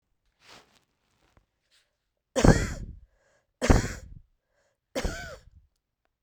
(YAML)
three_cough_length: 6.2 s
three_cough_amplitude: 24678
three_cough_signal_mean_std_ratio: 0.25
survey_phase: beta (2021-08-13 to 2022-03-07)
age: 45-64
gender: Female
wearing_mask: 'No'
symptom_cough_any: true
symptom_runny_or_blocked_nose: true
symptom_fatigue: true
symptom_change_to_sense_of_smell_or_taste: true
smoker_status: Ex-smoker
respiratory_condition_asthma: false
respiratory_condition_other: false
recruitment_source: Test and Trace
submission_delay: 2 days
covid_test_result: Positive
covid_test_method: RT-qPCR
covid_ct_value: 19.2
covid_ct_gene: ORF1ab gene
covid_ct_mean: 20.2
covid_viral_load: 240000 copies/ml
covid_viral_load_category: Low viral load (10K-1M copies/ml)